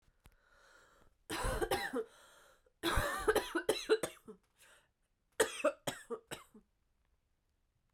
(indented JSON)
{
  "three_cough_length": "7.9 s",
  "three_cough_amplitude": 4883,
  "three_cough_signal_mean_std_ratio": 0.4,
  "survey_phase": "beta (2021-08-13 to 2022-03-07)",
  "age": "18-44",
  "gender": "Female",
  "wearing_mask": "No",
  "symptom_cough_any": true,
  "symptom_runny_or_blocked_nose": true,
  "symptom_shortness_of_breath": true,
  "symptom_fatigue": true,
  "symptom_fever_high_temperature": true,
  "symptom_headache": true,
  "symptom_other": true,
  "smoker_status": "Never smoked",
  "respiratory_condition_asthma": true,
  "respiratory_condition_other": false,
  "recruitment_source": "Test and Trace",
  "submission_delay": "2 days",
  "covid_test_result": "Positive",
  "covid_test_method": "LFT"
}